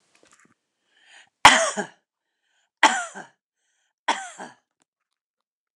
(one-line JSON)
{"three_cough_length": "5.8 s", "three_cough_amplitude": 29204, "three_cough_signal_mean_std_ratio": 0.22, "survey_phase": "alpha (2021-03-01 to 2021-08-12)", "age": "45-64", "gender": "Female", "wearing_mask": "No", "symptom_none": true, "smoker_status": "Never smoked", "respiratory_condition_asthma": false, "respiratory_condition_other": false, "recruitment_source": "REACT", "submission_delay": "2 days", "covid_test_result": "Negative", "covid_test_method": "RT-qPCR"}